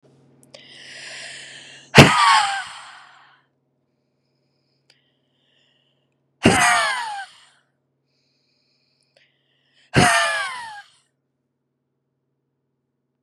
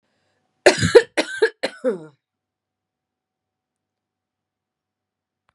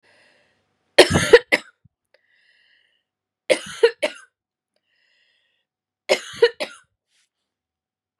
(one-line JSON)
{"exhalation_length": "13.2 s", "exhalation_amplitude": 32768, "exhalation_signal_mean_std_ratio": 0.29, "cough_length": "5.5 s", "cough_amplitude": 32768, "cough_signal_mean_std_ratio": 0.22, "three_cough_length": "8.2 s", "three_cough_amplitude": 32768, "three_cough_signal_mean_std_ratio": 0.22, "survey_phase": "beta (2021-08-13 to 2022-03-07)", "age": "18-44", "gender": "Female", "wearing_mask": "No", "symptom_cough_any": true, "symptom_runny_or_blocked_nose": true, "symptom_fatigue": true, "symptom_headache": true, "symptom_onset": "3 days", "smoker_status": "Current smoker (1 to 10 cigarettes per day)", "respiratory_condition_asthma": true, "respiratory_condition_other": false, "recruitment_source": "Test and Trace", "submission_delay": "2 days", "covid_test_result": "Positive", "covid_test_method": "RT-qPCR", "covid_ct_value": 20.2, "covid_ct_gene": "N gene"}